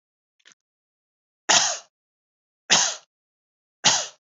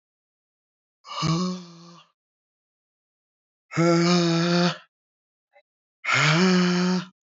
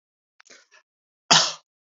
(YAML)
three_cough_length: 4.3 s
three_cough_amplitude: 24882
three_cough_signal_mean_std_ratio: 0.31
exhalation_length: 7.3 s
exhalation_amplitude: 14125
exhalation_signal_mean_std_ratio: 0.52
cough_length: 2.0 s
cough_amplitude: 29043
cough_signal_mean_std_ratio: 0.24
survey_phase: beta (2021-08-13 to 2022-03-07)
age: 45-64
gender: Male
wearing_mask: 'No'
symptom_none: true
smoker_status: Never smoked
respiratory_condition_asthma: false
respiratory_condition_other: false
recruitment_source: REACT
submission_delay: 4 days
covid_test_result: Negative
covid_test_method: RT-qPCR